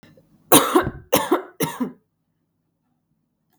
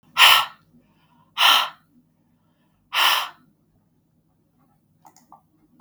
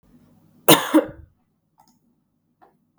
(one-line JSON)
{"three_cough_length": "3.6 s", "three_cough_amplitude": 32768, "three_cough_signal_mean_std_ratio": 0.33, "exhalation_length": "5.8 s", "exhalation_amplitude": 32768, "exhalation_signal_mean_std_ratio": 0.3, "cough_length": "3.0 s", "cough_amplitude": 32766, "cough_signal_mean_std_ratio": 0.23, "survey_phase": "beta (2021-08-13 to 2022-03-07)", "age": "18-44", "wearing_mask": "No", "symptom_fatigue": true, "symptom_fever_high_temperature": true, "smoker_status": "Never smoked", "respiratory_condition_asthma": false, "respiratory_condition_other": false, "recruitment_source": "Test and Trace", "submission_delay": "2 days", "covid_test_result": "Positive", "covid_test_method": "RT-qPCR", "covid_ct_value": 18.8, "covid_ct_gene": "ORF1ab gene", "covid_ct_mean": 19.0, "covid_viral_load": "570000 copies/ml", "covid_viral_load_category": "Low viral load (10K-1M copies/ml)"}